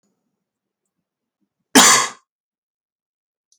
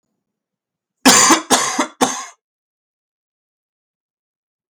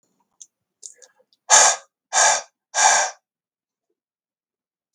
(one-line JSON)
{"cough_length": "3.6 s", "cough_amplitude": 32768, "cough_signal_mean_std_ratio": 0.24, "three_cough_length": "4.7 s", "three_cough_amplitude": 32768, "three_cough_signal_mean_std_ratio": 0.32, "exhalation_length": "4.9 s", "exhalation_amplitude": 32768, "exhalation_signal_mean_std_ratio": 0.33, "survey_phase": "beta (2021-08-13 to 2022-03-07)", "age": "18-44", "gender": "Male", "wearing_mask": "No", "symptom_new_continuous_cough": true, "symptom_runny_or_blocked_nose": true, "symptom_shortness_of_breath": true, "symptom_fatigue": true, "symptom_fever_high_temperature": true, "symptom_headache": true, "symptom_onset": "5 days", "smoker_status": "Never smoked", "respiratory_condition_asthma": false, "respiratory_condition_other": false, "recruitment_source": "Test and Trace", "submission_delay": "3 days", "covid_test_result": "Positive", "covid_test_method": "RT-qPCR", "covid_ct_value": 21.4, "covid_ct_gene": "ORF1ab gene", "covid_ct_mean": 21.8, "covid_viral_load": "68000 copies/ml", "covid_viral_load_category": "Low viral load (10K-1M copies/ml)"}